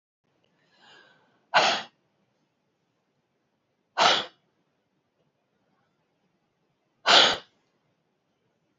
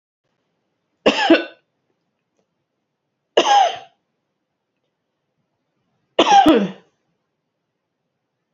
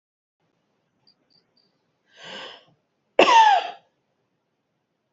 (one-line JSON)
{"exhalation_length": "8.8 s", "exhalation_amplitude": 20561, "exhalation_signal_mean_std_ratio": 0.23, "three_cough_length": "8.5 s", "three_cough_amplitude": 30682, "three_cough_signal_mean_std_ratio": 0.29, "cough_length": "5.1 s", "cough_amplitude": 27328, "cough_signal_mean_std_ratio": 0.26, "survey_phase": "beta (2021-08-13 to 2022-03-07)", "age": "45-64", "gender": "Female", "wearing_mask": "No", "symptom_abdominal_pain": true, "symptom_fatigue": true, "symptom_headache": true, "symptom_onset": "7 days", "smoker_status": "Current smoker (1 to 10 cigarettes per day)", "respiratory_condition_asthma": true, "respiratory_condition_other": true, "recruitment_source": "REACT", "submission_delay": "1 day", "covid_test_result": "Negative", "covid_test_method": "RT-qPCR", "influenza_a_test_result": "Negative", "influenza_b_test_result": "Negative"}